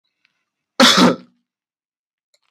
{
  "cough_length": "2.5 s",
  "cough_amplitude": 32768,
  "cough_signal_mean_std_ratio": 0.3,
  "survey_phase": "beta (2021-08-13 to 2022-03-07)",
  "age": "18-44",
  "gender": "Male",
  "wearing_mask": "No",
  "symptom_none": true,
  "smoker_status": "Ex-smoker",
  "respiratory_condition_asthma": false,
  "respiratory_condition_other": false,
  "recruitment_source": "REACT",
  "submission_delay": "3 days",
  "covid_test_result": "Negative",
  "covid_test_method": "RT-qPCR",
  "influenza_a_test_result": "Negative",
  "influenza_b_test_result": "Negative"
}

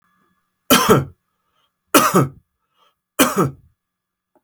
{
  "three_cough_length": "4.4 s",
  "three_cough_amplitude": 32768,
  "three_cough_signal_mean_std_ratio": 0.36,
  "survey_phase": "alpha (2021-03-01 to 2021-08-12)",
  "age": "45-64",
  "gender": "Male",
  "wearing_mask": "No",
  "symptom_none": true,
  "smoker_status": "Never smoked",
  "respiratory_condition_asthma": false,
  "respiratory_condition_other": false,
  "recruitment_source": "REACT",
  "submission_delay": "2 days",
  "covid_test_result": "Negative",
  "covid_test_method": "RT-qPCR"
}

